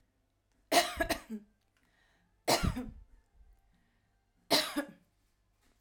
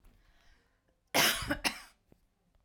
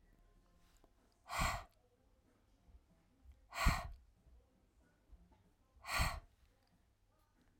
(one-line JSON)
{"three_cough_length": "5.8 s", "three_cough_amplitude": 8369, "three_cough_signal_mean_std_ratio": 0.33, "cough_length": "2.6 s", "cough_amplitude": 8690, "cough_signal_mean_std_ratio": 0.34, "exhalation_length": "7.6 s", "exhalation_amplitude": 3018, "exhalation_signal_mean_std_ratio": 0.3, "survey_phase": "beta (2021-08-13 to 2022-03-07)", "age": "45-64", "gender": "Female", "wearing_mask": "No", "symptom_headache": true, "smoker_status": "Ex-smoker", "respiratory_condition_asthma": true, "respiratory_condition_other": false, "recruitment_source": "REACT", "submission_delay": "2 days", "covid_test_result": "Negative", "covid_test_method": "RT-qPCR"}